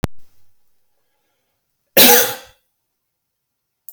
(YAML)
cough_length: 3.9 s
cough_amplitude: 32768
cough_signal_mean_std_ratio: 0.27
survey_phase: beta (2021-08-13 to 2022-03-07)
age: 65+
gender: Male
wearing_mask: 'No'
symptom_none: true
smoker_status: Never smoked
respiratory_condition_asthma: false
respiratory_condition_other: false
recruitment_source: REACT
submission_delay: 1 day
covid_test_result: Negative
covid_test_method: RT-qPCR